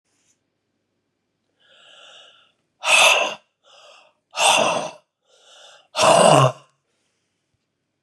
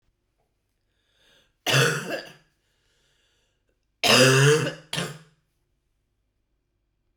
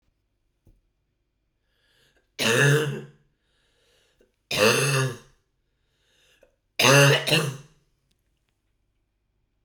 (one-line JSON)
{"exhalation_length": "8.0 s", "exhalation_amplitude": 30583, "exhalation_signal_mean_std_ratio": 0.35, "cough_length": "7.2 s", "cough_amplitude": 25313, "cough_signal_mean_std_ratio": 0.33, "three_cough_length": "9.6 s", "three_cough_amplitude": 20480, "three_cough_signal_mean_std_ratio": 0.35, "survey_phase": "alpha (2021-03-01 to 2021-08-12)", "age": "45-64", "gender": "Female", "wearing_mask": "No", "symptom_cough_any": true, "symptom_new_continuous_cough": true, "symptom_shortness_of_breath": true, "symptom_fatigue": true, "symptom_headache": true, "smoker_status": "Never smoked", "respiratory_condition_asthma": false, "respiratory_condition_other": false, "recruitment_source": "Test and Trace", "submission_delay": "1 day", "covid_test_result": "Positive", "covid_test_method": "RT-qPCR"}